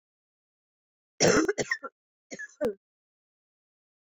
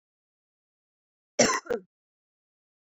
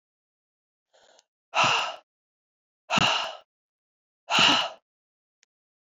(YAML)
three_cough_length: 4.2 s
three_cough_amplitude: 11687
three_cough_signal_mean_std_ratio: 0.29
cough_length: 2.9 s
cough_amplitude: 14925
cough_signal_mean_std_ratio: 0.23
exhalation_length: 6.0 s
exhalation_amplitude: 14278
exhalation_signal_mean_std_ratio: 0.34
survey_phase: beta (2021-08-13 to 2022-03-07)
age: 18-44
gender: Female
wearing_mask: 'No'
symptom_cough_any: true
symptom_headache: true
symptom_change_to_sense_of_smell_or_taste: true
symptom_loss_of_taste: true
symptom_onset: 5 days
smoker_status: Never smoked
respiratory_condition_asthma: false
respiratory_condition_other: false
recruitment_source: Test and Trace
submission_delay: 2 days
covid_test_result: Positive
covid_test_method: RT-qPCR
covid_ct_value: 17.4
covid_ct_gene: ORF1ab gene
covid_ct_mean: 18.0
covid_viral_load: 1300000 copies/ml
covid_viral_load_category: High viral load (>1M copies/ml)